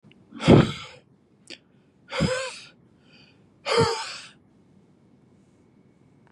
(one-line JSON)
{"exhalation_length": "6.3 s", "exhalation_amplitude": 28552, "exhalation_signal_mean_std_ratio": 0.3, "survey_phase": "beta (2021-08-13 to 2022-03-07)", "age": "45-64", "gender": "Male", "wearing_mask": "No", "symptom_none": true, "smoker_status": "Never smoked", "respiratory_condition_asthma": false, "respiratory_condition_other": false, "recruitment_source": "REACT", "submission_delay": "1 day", "covid_test_result": "Negative", "covid_test_method": "RT-qPCR", "influenza_a_test_result": "Negative", "influenza_b_test_result": "Negative"}